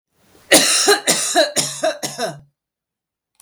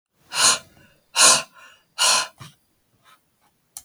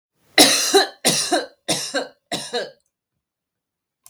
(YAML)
cough_length: 3.4 s
cough_amplitude: 32768
cough_signal_mean_std_ratio: 0.51
exhalation_length: 3.8 s
exhalation_amplitude: 30221
exhalation_signal_mean_std_ratio: 0.36
three_cough_length: 4.1 s
three_cough_amplitude: 32768
three_cough_signal_mean_std_ratio: 0.42
survey_phase: beta (2021-08-13 to 2022-03-07)
age: 45-64
gender: Female
wearing_mask: 'No'
symptom_none: true
smoker_status: Ex-smoker
respiratory_condition_asthma: false
respiratory_condition_other: false
recruitment_source: REACT
submission_delay: 2 days
covid_test_result: Negative
covid_test_method: RT-qPCR